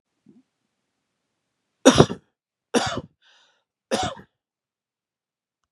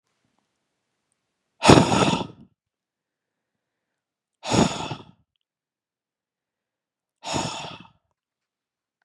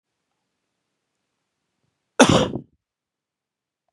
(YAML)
three_cough_length: 5.7 s
three_cough_amplitude: 32768
three_cough_signal_mean_std_ratio: 0.21
exhalation_length: 9.0 s
exhalation_amplitude: 32767
exhalation_signal_mean_std_ratio: 0.25
cough_length: 3.9 s
cough_amplitude: 32767
cough_signal_mean_std_ratio: 0.2
survey_phase: beta (2021-08-13 to 2022-03-07)
age: 18-44
gender: Male
wearing_mask: 'No'
symptom_none: true
smoker_status: Never smoked
respiratory_condition_asthma: true
respiratory_condition_other: false
recruitment_source: REACT
submission_delay: 2 days
covid_test_result: Negative
covid_test_method: RT-qPCR
influenza_a_test_result: Unknown/Void
influenza_b_test_result: Unknown/Void